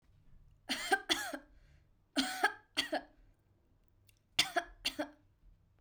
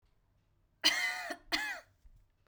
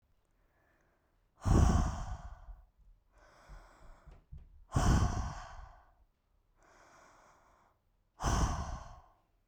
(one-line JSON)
{"three_cough_length": "5.8 s", "three_cough_amplitude": 6016, "three_cough_signal_mean_std_ratio": 0.37, "cough_length": "2.5 s", "cough_amplitude": 7873, "cough_signal_mean_std_ratio": 0.42, "exhalation_length": "9.5 s", "exhalation_amplitude": 6199, "exhalation_signal_mean_std_ratio": 0.37, "survey_phase": "beta (2021-08-13 to 2022-03-07)", "age": "18-44", "gender": "Female", "wearing_mask": "No", "symptom_none": true, "smoker_status": "Never smoked", "recruitment_source": "REACT", "submission_delay": "1 day", "covid_test_result": "Negative", "covid_test_method": "RT-qPCR"}